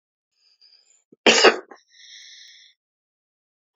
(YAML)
cough_length: 3.8 s
cough_amplitude: 29819
cough_signal_mean_std_ratio: 0.22
survey_phase: beta (2021-08-13 to 2022-03-07)
age: 65+
gender: Male
wearing_mask: 'No'
symptom_cough_any: true
smoker_status: Ex-smoker
respiratory_condition_asthma: false
respiratory_condition_other: false
recruitment_source: REACT
submission_delay: 2 days
covid_test_result: Negative
covid_test_method: RT-qPCR